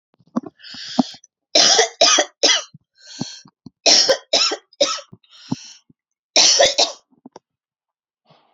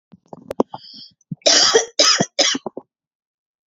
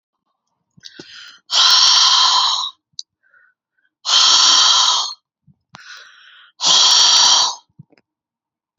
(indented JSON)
{
  "three_cough_length": "8.5 s",
  "three_cough_amplitude": 32767,
  "three_cough_signal_mean_std_ratio": 0.41,
  "cough_length": "3.7 s",
  "cough_amplitude": 31846,
  "cough_signal_mean_std_ratio": 0.41,
  "exhalation_length": "8.8 s",
  "exhalation_amplitude": 32768,
  "exhalation_signal_mean_std_ratio": 0.53,
  "survey_phase": "beta (2021-08-13 to 2022-03-07)",
  "age": "18-44",
  "gender": "Female",
  "wearing_mask": "No",
  "symptom_runny_or_blocked_nose": true,
  "symptom_onset": "12 days",
  "smoker_status": "Never smoked",
  "respiratory_condition_asthma": false,
  "respiratory_condition_other": false,
  "recruitment_source": "REACT",
  "submission_delay": "0 days",
  "covid_test_result": "Negative",
  "covid_test_method": "RT-qPCR",
  "influenza_a_test_result": "Negative",
  "influenza_b_test_result": "Negative"
}